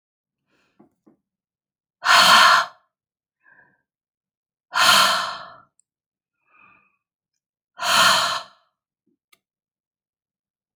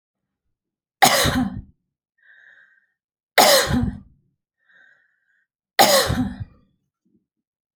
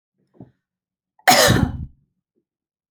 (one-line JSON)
{"exhalation_length": "10.8 s", "exhalation_amplitude": 29689, "exhalation_signal_mean_std_ratio": 0.32, "three_cough_length": "7.8 s", "three_cough_amplitude": 32767, "three_cough_signal_mean_std_ratio": 0.35, "cough_length": "2.9 s", "cough_amplitude": 32768, "cough_signal_mean_std_ratio": 0.32, "survey_phase": "beta (2021-08-13 to 2022-03-07)", "age": "45-64", "gender": "Female", "wearing_mask": "No", "symptom_none": true, "smoker_status": "Never smoked", "respiratory_condition_asthma": false, "respiratory_condition_other": false, "recruitment_source": "Test and Trace", "submission_delay": "2 days", "covid_test_result": "Negative", "covid_test_method": "LFT"}